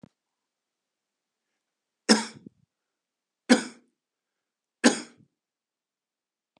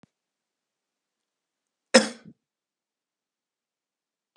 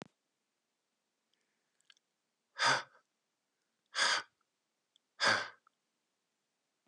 {"three_cough_length": "6.6 s", "three_cough_amplitude": 25359, "three_cough_signal_mean_std_ratio": 0.18, "cough_length": "4.4 s", "cough_amplitude": 32186, "cough_signal_mean_std_ratio": 0.12, "exhalation_length": "6.9 s", "exhalation_amplitude": 4745, "exhalation_signal_mean_std_ratio": 0.26, "survey_phase": "beta (2021-08-13 to 2022-03-07)", "age": "45-64", "gender": "Male", "wearing_mask": "No", "symptom_cough_any": true, "symptom_runny_or_blocked_nose": true, "symptom_fatigue": true, "symptom_other": true, "smoker_status": "Never smoked", "respiratory_condition_asthma": false, "respiratory_condition_other": false, "recruitment_source": "Test and Trace", "submission_delay": "2 days", "covid_test_result": "Positive", "covid_test_method": "RT-qPCR", "covid_ct_value": 23.5, "covid_ct_gene": "ORF1ab gene", "covid_ct_mean": 23.9, "covid_viral_load": "15000 copies/ml", "covid_viral_load_category": "Low viral load (10K-1M copies/ml)"}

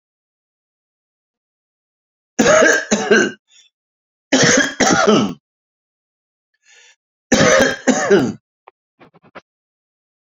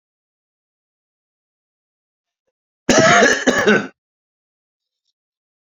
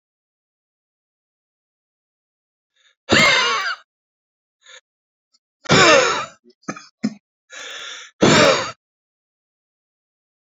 {"three_cough_length": "10.2 s", "three_cough_amplitude": 32768, "three_cough_signal_mean_std_ratio": 0.41, "cough_length": "5.6 s", "cough_amplitude": 29783, "cough_signal_mean_std_ratio": 0.31, "exhalation_length": "10.5 s", "exhalation_amplitude": 29116, "exhalation_signal_mean_std_ratio": 0.33, "survey_phase": "beta (2021-08-13 to 2022-03-07)", "age": "45-64", "gender": "Male", "wearing_mask": "No", "symptom_shortness_of_breath": true, "smoker_status": "Ex-smoker", "respiratory_condition_asthma": false, "respiratory_condition_other": true, "recruitment_source": "REACT", "submission_delay": "3 days", "covid_test_result": "Negative", "covid_test_method": "RT-qPCR", "influenza_a_test_result": "Negative", "influenza_b_test_result": "Negative"}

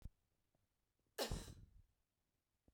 {"cough_length": "2.7 s", "cough_amplitude": 1033, "cough_signal_mean_std_ratio": 0.3, "survey_phase": "beta (2021-08-13 to 2022-03-07)", "age": "18-44", "gender": "Female", "wearing_mask": "No", "symptom_runny_or_blocked_nose": true, "symptom_sore_throat": true, "symptom_fatigue": true, "symptom_headache": true, "symptom_change_to_sense_of_smell_or_taste": true, "smoker_status": "Current smoker (1 to 10 cigarettes per day)", "respiratory_condition_asthma": false, "respiratory_condition_other": false, "recruitment_source": "Test and Trace", "submission_delay": "2 days", "covid_test_result": "Positive", "covid_test_method": "RT-qPCR", "covid_ct_value": 35.1, "covid_ct_gene": "N gene"}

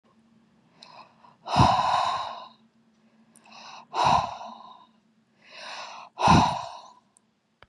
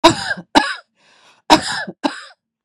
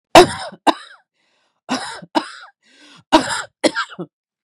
{"exhalation_length": "7.7 s", "exhalation_amplitude": 15952, "exhalation_signal_mean_std_ratio": 0.39, "cough_length": "2.6 s", "cough_amplitude": 32768, "cough_signal_mean_std_ratio": 0.37, "three_cough_length": "4.4 s", "three_cough_amplitude": 32768, "three_cough_signal_mean_std_ratio": 0.3, "survey_phase": "beta (2021-08-13 to 2022-03-07)", "age": "18-44", "gender": "Female", "wearing_mask": "No", "symptom_cough_any": true, "symptom_sore_throat": true, "smoker_status": "Ex-smoker", "respiratory_condition_asthma": false, "respiratory_condition_other": false, "recruitment_source": "REACT", "submission_delay": "-1 day", "covid_test_result": "Negative", "covid_test_method": "RT-qPCR", "influenza_a_test_result": "Negative", "influenza_b_test_result": "Negative"}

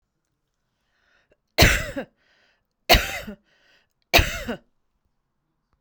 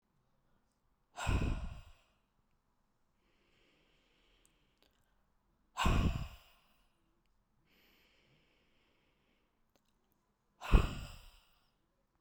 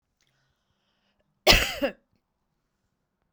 {"three_cough_length": "5.8 s", "three_cough_amplitude": 31401, "three_cough_signal_mean_std_ratio": 0.27, "exhalation_length": "12.2 s", "exhalation_amplitude": 9311, "exhalation_signal_mean_std_ratio": 0.24, "cough_length": "3.3 s", "cough_amplitude": 24300, "cough_signal_mean_std_ratio": 0.23, "survey_phase": "beta (2021-08-13 to 2022-03-07)", "age": "45-64", "gender": "Female", "wearing_mask": "No", "symptom_other": true, "smoker_status": "Ex-smoker", "respiratory_condition_asthma": false, "respiratory_condition_other": false, "recruitment_source": "REACT", "submission_delay": "1 day", "covid_test_result": "Negative", "covid_test_method": "RT-qPCR"}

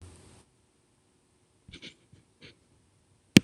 {"exhalation_length": "3.4 s", "exhalation_amplitude": 26028, "exhalation_signal_mean_std_ratio": 0.09, "survey_phase": "beta (2021-08-13 to 2022-03-07)", "age": "65+", "gender": "Female", "wearing_mask": "No", "symptom_none": true, "smoker_status": "Never smoked", "respiratory_condition_asthma": false, "respiratory_condition_other": false, "recruitment_source": "REACT", "submission_delay": "1 day", "covid_test_result": "Negative", "covid_test_method": "RT-qPCR"}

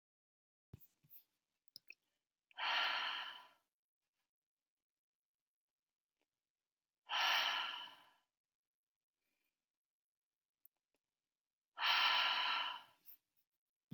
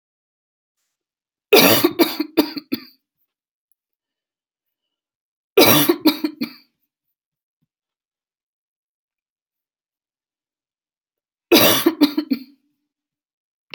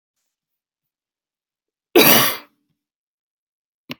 {"exhalation_length": "13.9 s", "exhalation_amplitude": 2739, "exhalation_signal_mean_std_ratio": 0.34, "three_cough_length": "13.7 s", "three_cough_amplitude": 32768, "three_cough_signal_mean_std_ratio": 0.28, "cough_length": "4.0 s", "cough_amplitude": 32768, "cough_signal_mean_std_ratio": 0.24, "survey_phase": "beta (2021-08-13 to 2022-03-07)", "age": "18-44", "gender": "Female", "wearing_mask": "No", "symptom_cough_any": true, "symptom_shortness_of_breath": true, "symptom_headache": true, "smoker_status": "Never smoked", "respiratory_condition_asthma": false, "respiratory_condition_other": false, "recruitment_source": "REACT", "submission_delay": "2 days", "covid_test_result": "Negative", "covid_test_method": "RT-qPCR", "influenza_a_test_result": "Negative", "influenza_b_test_result": "Negative"}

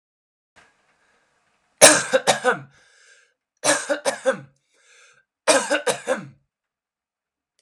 {"three_cough_length": "7.6 s", "three_cough_amplitude": 32768, "three_cough_signal_mean_std_ratio": 0.31, "survey_phase": "alpha (2021-03-01 to 2021-08-12)", "age": "18-44", "gender": "Male", "wearing_mask": "No", "symptom_cough_any": true, "symptom_new_continuous_cough": true, "symptom_diarrhoea": true, "symptom_fatigue": true, "symptom_fever_high_temperature": true, "symptom_headache": true, "symptom_onset": "7 days", "smoker_status": "Never smoked", "respiratory_condition_asthma": false, "respiratory_condition_other": false, "recruitment_source": "Test and Trace", "submission_delay": "2 days", "covid_test_result": "Positive", "covid_test_method": "RT-qPCR", "covid_ct_value": 16.0, "covid_ct_gene": "ORF1ab gene", "covid_ct_mean": 16.5, "covid_viral_load": "4000000 copies/ml", "covid_viral_load_category": "High viral load (>1M copies/ml)"}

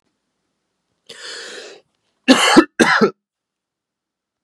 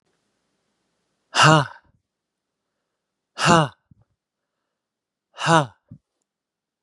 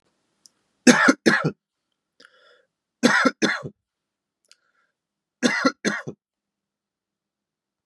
{"cough_length": "4.4 s", "cough_amplitude": 32768, "cough_signal_mean_std_ratio": 0.31, "exhalation_length": "6.8 s", "exhalation_amplitude": 32050, "exhalation_signal_mean_std_ratio": 0.24, "three_cough_length": "7.9 s", "three_cough_amplitude": 32665, "three_cough_signal_mean_std_ratio": 0.3, "survey_phase": "beta (2021-08-13 to 2022-03-07)", "age": "18-44", "gender": "Male", "wearing_mask": "No", "symptom_fatigue": true, "symptom_onset": "6 days", "smoker_status": "Never smoked", "respiratory_condition_asthma": false, "respiratory_condition_other": false, "recruitment_source": "REACT", "submission_delay": "2 days", "covid_test_result": "Negative", "covid_test_method": "RT-qPCR", "influenza_a_test_result": "Negative", "influenza_b_test_result": "Negative"}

